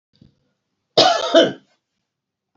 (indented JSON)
{
  "cough_length": "2.6 s",
  "cough_amplitude": 30617,
  "cough_signal_mean_std_ratio": 0.34,
  "survey_phase": "beta (2021-08-13 to 2022-03-07)",
  "age": "65+",
  "gender": "Female",
  "wearing_mask": "No",
  "symptom_none": true,
  "smoker_status": "Ex-smoker",
  "respiratory_condition_asthma": false,
  "respiratory_condition_other": false,
  "recruitment_source": "REACT",
  "submission_delay": "2 days",
  "covid_test_result": "Negative",
  "covid_test_method": "RT-qPCR",
  "influenza_a_test_result": "Negative",
  "influenza_b_test_result": "Negative"
}